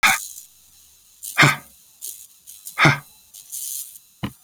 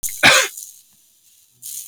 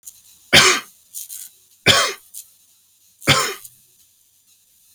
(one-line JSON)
{"exhalation_length": "4.4 s", "exhalation_amplitude": 29480, "exhalation_signal_mean_std_ratio": 0.34, "cough_length": "1.9 s", "cough_amplitude": 31381, "cough_signal_mean_std_ratio": 0.36, "three_cough_length": "4.9 s", "three_cough_amplitude": 32768, "three_cough_signal_mean_std_ratio": 0.32, "survey_phase": "beta (2021-08-13 to 2022-03-07)", "age": "65+", "gender": "Male", "wearing_mask": "No", "symptom_none": true, "smoker_status": "Never smoked", "respiratory_condition_asthma": false, "respiratory_condition_other": false, "recruitment_source": "REACT", "submission_delay": "1 day", "covid_test_result": "Negative", "covid_test_method": "RT-qPCR"}